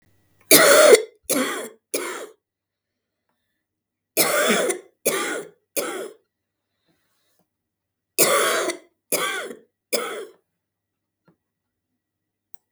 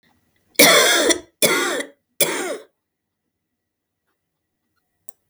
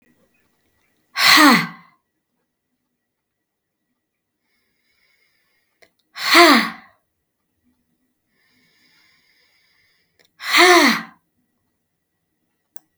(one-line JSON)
{"three_cough_length": "12.7 s", "three_cough_amplitude": 32768, "three_cough_signal_mean_std_ratio": 0.36, "cough_length": "5.3 s", "cough_amplitude": 32768, "cough_signal_mean_std_ratio": 0.37, "exhalation_length": "13.0 s", "exhalation_amplitude": 32768, "exhalation_signal_mean_std_ratio": 0.27, "survey_phase": "beta (2021-08-13 to 2022-03-07)", "age": "45-64", "gender": "Female", "wearing_mask": "No", "symptom_cough_any": true, "symptom_runny_or_blocked_nose": true, "symptom_sore_throat": true, "symptom_headache": true, "symptom_onset": "4 days", "smoker_status": "Ex-smoker", "respiratory_condition_asthma": false, "respiratory_condition_other": false, "recruitment_source": "Test and Trace", "submission_delay": "2 days", "covid_test_result": "Positive", "covid_test_method": "RT-qPCR", "covid_ct_value": 17.8, "covid_ct_gene": "ORF1ab gene"}